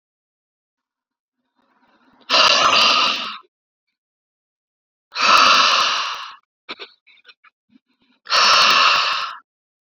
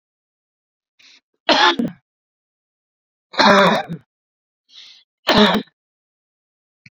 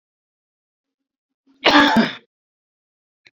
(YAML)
exhalation_length: 9.9 s
exhalation_amplitude: 28957
exhalation_signal_mean_std_ratio: 0.46
three_cough_length: 6.9 s
three_cough_amplitude: 32767
three_cough_signal_mean_std_ratio: 0.33
cough_length: 3.3 s
cough_amplitude: 28755
cough_signal_mean_std_ratio: 0.29
survey_phase: beta (2021-08-13 to 2022-03-07)
age: 18-44
gender: Male
wearing_mask: 'No'
symptom_none: true
smoker_status: Never smoked
respiratory_condition_asthma: false
respiratory_condition_other: false
recruitment_source: REACT
submission_delay: 1 day
covid_test_result: Negative
covid_test_method: RT-qPCR
influenza_a_test_result: Negative
influenza_b_test_result: Negative